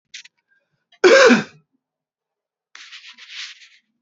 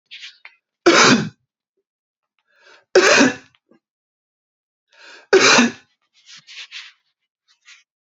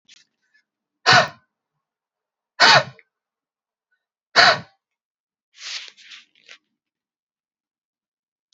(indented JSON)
{
  "cough_length": "4.0 s",
  "cough_amplitude": 32767,
  "cough_signal_mean_std_ratio": 0.28,
  "three_cough_length": "8.1 s",
  "three_cough_amplitude": 31322,
  "three_cough_signal_mean_std_ratio": 0.32,
  "exhalation_length": "8.5 s",
  "exhalation_amplitude": 30680,
  "exhalation_signal_mean_std_ratio": 0.23,
  "survey_phase": "beta (2021-08-13 to 2022-03-07)",
  "age": "18-44",
  "gender": "Male",
  "wearing_mask": "No",
  "symptom_runny_or_blocked_nose": true,
  "smoker_status": "Never smoked",
  "respiratory_condition_asthma": false,
  "respiratory_condition_other": false,
  "recruitment_source": "REACT",
  "submission_delay": "0 days",
  "covid_test_result": "Negative",
  "covid_test_method": "RT-qPCR"
}